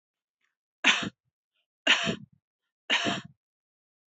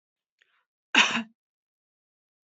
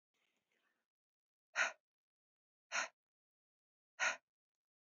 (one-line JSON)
{"three_cough_length": "4.2 s", "three_cough_amplitude": 17128, "three_cough_signal_mean_std_ratio": 0.32, "cough_length": "2.5 s", "cough_amplitude": 19703, "cough_signal_mean_std_ratio": 0.23, "exhalation_length": "4.9 s", "exhalation_amplitude": 2470, "exhalation_signal_mean_std_ratio": 0.23, "survey_phase": "beta (2021-08-13 to 2022-03-07)", "age": "45-64", "gender": "Female", "wearing_mask": "No", "symptom_sore_throat": true, "symptom_fatigue": true, "symptom_headache": true, "symptom_onset": "2 days", "smoker_status": "Never smoked", "respiratory_condition_asthma": false, "respiratory_condition_other": false, "recruitment_source": "Test and Trace", "submission_delay": "2 days", "covid_test_result": "Positive", "covid_test_method": "RT-qPCR", "covid_ct_value": 27.4, "covid_ct_gene": "ORF1ab gene", "covid_ct_mean": 28.1, "covid_viral_load": "600 copies/ml", "covid_viral_load_category": "Minimal viral load (< 10K copies/ml)"}